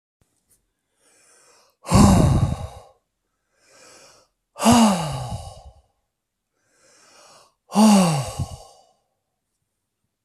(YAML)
exhalation_length: 10.2 s
exhalation_amplitude: 25218
exhalation_signal_mean_std_ratio: 0.36
survey_phase: alpha (2021-03-01 to 2021-08-12)
age: 45-64
gender: Male
wearing_mask: 'No'
symptom_cough_any: true
symptom_abdominal_pain: true
symptom_fatigue: true
symptom_fever_high_temperature: true
symptom_headache: true
symptom_onset: 3 days
smoker_status: Ex-smoker
respiratory_condition_asthma: false
respiratory_condition_other: false
recruitment_source: Test and Trace
submission_delay: 1 day
covid_test_result: Positive
covid_test_method: RT-qPCR
covid_ct_value: 19.3
covid_ct_gene: ORF1ab gene
covid_ct_mean: 19.8
covid_viral_load: 310000 copies/ml
covid_viral_load_category: Low viral load (10K-1M copies/ml)